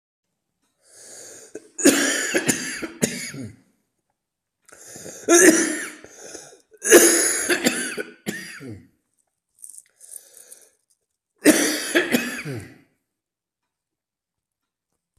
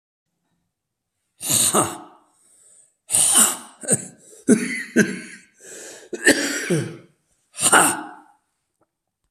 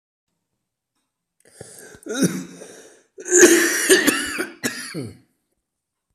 {"three_cough_length": "15.2 s", "three_cough_amplitude": 32767, "three_cough_signal_mean_std_ratio": 0.37, "exhalation_length": "9.3 s", "exhalation_amplitude": 32767, "exhalation_signal_mean_std_ratio": 0.42, "cough_length": "6.1 s", "cough_amplitude": 32768, "cough_signal_mean_std_ratio": 0.38, "survey_phase": "beta (2021-08-13 to 2022-03-07)", "age": "65+", "gender": "Male", "wearing_mask": "No", "symptom_cough_any": true, "symptom_runny_or_blocked_nose": true, "symptom_shortness_of_breath": true, "symptom_fatigue": true, "symptom_headache": true, "symptom_onset": "3 days", "smoker_status": "Ex-smoker", "respiratory_condition_asthma": true, "respiratory_condition_other": false, "recruitment_source": "Test and Trace", "submission_delay": "2 days", "covid_test_result": "Positive", "covid_test_method": "RT-qPCR", "covid_ct_value": 21.9, "covid_ct_gene": "ORF1ab gene"}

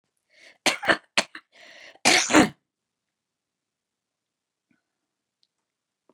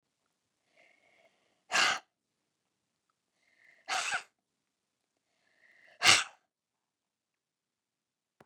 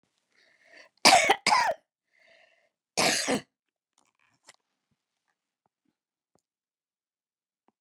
{"cough_length": "6.1 s", "cough_amplitude": 27141, "cough_signal_mean_std_ratio": 0.24, "exhalation_length": "8.5 s", "exhalation_amplitude": 17239, "exhalation_signal_mean_std_ratio": 0.21, "three_cough_length": "7.8 s", "three_cough_amplitude": 30142, "three_cough_signal_mean_std_ratio": 0.25, "survey_phase": "beta (2021-08-13 to 2022-03-07)", "age": "65+", "gender": "Female", "wearing_mask": "No", "symptom_none": true, "smoker_status": "Ex-smoker", "respiratory_condition_asthma": true, "respiratory_condition_other": false, "recruitment_source": "REACT", "submission_delay": "1 day", "covid_test_result": "Negative", "covid_test_method": "RT-qPCR", "influenza_a_test_result": "Negative", "influenza_b_test_result": "Negative"}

